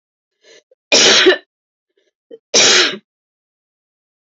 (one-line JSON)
{"cough_length": "4.3 s", "cough_amplitude": 32767, "cough_signal_mean_std_ratio": 0.38, "survey_phase": "beta (2021-08-13 to 2022-03-07)", "age": "45-64", "gender": "Female", "wearing_mask": "No", "symptom_cough_any": true, "symptom_runny_or_blocked_nose": true, "symptom_diarrhoea": true, "symptom_onset": "12 days", "smoker_status": "Never smoked", "respiratory_condition_asthma": true, "respiratory_condition_other": false, "recruitment_source": "REACT", "submission_delay": "2 days", "covid_test_result": "Negative", "covid_test_method": "RT-qPCR"}